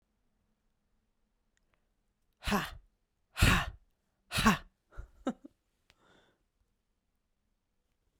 exhalation_length: 8.2 s
exhalation_amplitude: 10033
exhalation_signal_mean_std_ratio: 0.24
survey_phase: beta (2021-08-13 to 2022-03-07)
age: 18-44
gender: Female
wearing_mask: 'No'
symptom_none: true
smoker_status: Never smoked
respiratory_condition_asthma: false
respiratory_condition_other: false
recruitment_source: REACT
submission_delay: 2 days
covid_test_result: Negative
covid_test_method: RT-qPCR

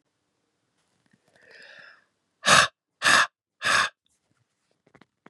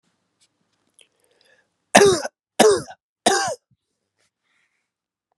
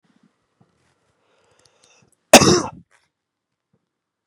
exhalation_length: 5.3 s
exhalation_amplitude: 23396
exhalation_signal_mean_std_ratio: 0.29
three_cough_length: 5.4 s
three_cough_amplitude: 32768
three_cough_signal_mean_std_ratio: 0.28
cough_length: 4.3 s
cough_amplitude: 32768
cough_signal_mean_std_ratio: 0.19
survey_phase: beta (2021-08-13 to 2022-03-07)
age: 18-44
gender: Male
wearing_mask: 'No'
symptom_runny_or_blocked_nose: true
smoker_status: Never smoked
respiratory_condition_asthma: false
respiratory_condition_other: false
recruitment_source: Test and Trace
submission_delay: 2 days
covid_test_result: Positive
covid_test_method: RT-qPCR
covid_ct_value: 21.6
covid_ct_gene: ORF1ab gene
covid_ct_mean: 22.0
covid_viral_load: 61000 copies/ml
covid_viral_load_category: Low viral load (10K-1M copies/ml)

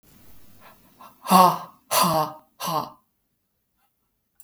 exhalation_length: 4.4 s
exhalation_amplitude: 30387
exhalation_signal_mean_std_ratio: 0.34
survey_phase: beta (2021-08-13 to 2022-03-07)
age: 45-64
gender: Female
wearing_mask: 'No'
symptom_cough_any: true
symptom_new_continuous_cough: true
symptom_runny_or_blocked_nose: true
symptom_abdominal_pain: true
symptom_fatigue: true
symptom_fever_high_temperature: true
symptom_headache: true
symptom_onset: 3 days
smoker_status: Never smoked
respiratory_condition_asthma: false
respiratory_condition_other: false
recruitment_source: Test and Trace
submission_delay: 1 day
covid_test_result: Positive
covid_test_method: RT-qPCR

